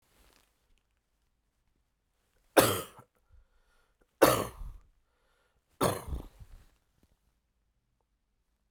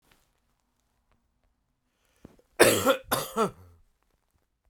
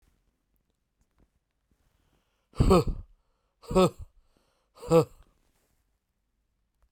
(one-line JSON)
{"three_cough_length": "8.7 s", "three_cough_amplitude": 20398, "three_cough_signal_mean_std_ratio": 0.22, "cough_length": "4.7 s", "cough_amplitude": 21985, "cough_signal_mean_std_ratio": 0.27, "exhalation_length": "6.9 s", "exhalation_amplitude": 10877, "exhalation_signal_mean_std_ratio": 0.26, "survey_phase": "beta (2021-08-13 to 2022-03-07)", "age": "45-64", "gender": "Male", "wearing_mask": "No", "symptom_cough_any": true, "symptom_shortness_of_breath": true, "symptom_fatigue": true, "symptom_headache": true, "smoker_status": "Never smoked", "respiratory_condition_asthma": false, "respiratory_condition_other": false, "recruitment_source": "Test and Trace", "submission_delay": "3 days", "covid_test_result": "Positive", "covid_test_method": "RT-qPCR", "covid_ct_value": 25.7, "covid_ct_gene": "ORF1ab gene", "covid_ct_mean": 26.3, "covid_viral_load": "2300 copies/ml", "covid_viral_load_category": "Minimal viral load (< 10K copies/ml)"}